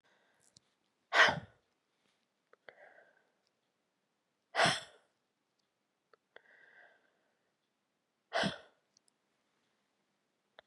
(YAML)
exhalation_length: 10.7 s
exhalation_amplitude: 8133
exhalation_signal_mean_std_ratio: 0.19
survey_phase: beta (2021-08-13 to 2022-03-07)
age: 45-64
gender: Female
wearing_mask: 'No'
symptom_cough_any: true
symptom_onset: 30 days
smoker_status: Never smoked
respiratory_condition_asthma: false
respiratory_condition_other: false
recruitment_source: Test and Trace
submission_delay: 1 day
covid_test_result: Negative
covid_test_method: RT-qPCR